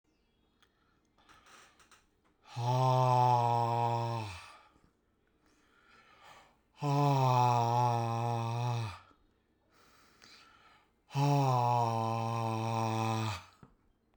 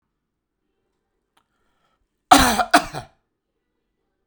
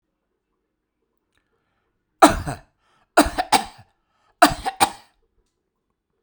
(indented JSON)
{
  "exhalation_length": "14.2 s",
  "exhalation_amplitude": 4519,
  "exhalation_signal_mean_std_ratio": 0.61,
  "cough_length": "4.3 s",
  "cough_amplitude": 32768,
  "cough_signal_mean_std_ratio": 0.23,
  "three_cough_length": "6.2 s",
  "three_cough_amplitude": 32768,
  "three_cough_signal_mean_std_ratio": 0.24,
  "survey_phase": "beta (2021-08-13 to 2022-03-07)",
  "age": "45-64",
  "gender": "Male",
  "wearing_mask": "No",
  "symptom_none": true,
  "smoker_status": "Ex-smoker",
  "respiratory_condition_asthma": false,
  "respiratory_condition_other": false,
  "recruitment_source": "REACT",
  "submission_delay": "4 days",
  "covid_test_result": "Negative",
  "covid_test_method": "RT-qPCR"
}